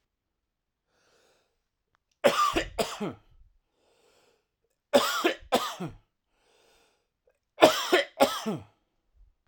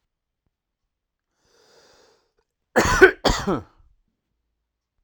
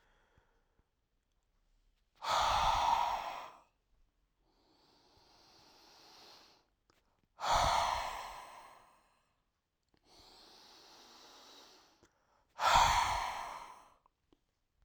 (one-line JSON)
{"three_cough_length": "9.5 s", "three_cough_amplitude": 32767, "three_cough_signal_mean_std_ratio": 0.32, "cough_length": "5.0 s", "cough_amplitude": 32768, "cough_signal_mean_std_ratio": 0.24, "exhalation_length": "14.8 s", "exhalation_amplitude": 6557, "exhalation_signal_mean_std_ratio": 0.37, "survey_phase": "alpha (2021-03-01 to 2021-08-12)", "age": "18-44", "gender": "Male", "wearing_mask": "No", "symptom_none": true, "smoker_status": "Never smoked", "respiratory_condition_asthma": true, "respiratory_condition_other": false, "recruitment_source": "REACT", "submission_delay": "4 days", "covid_test_result": "Negative", "covid_test_method": "RT-qPCR"}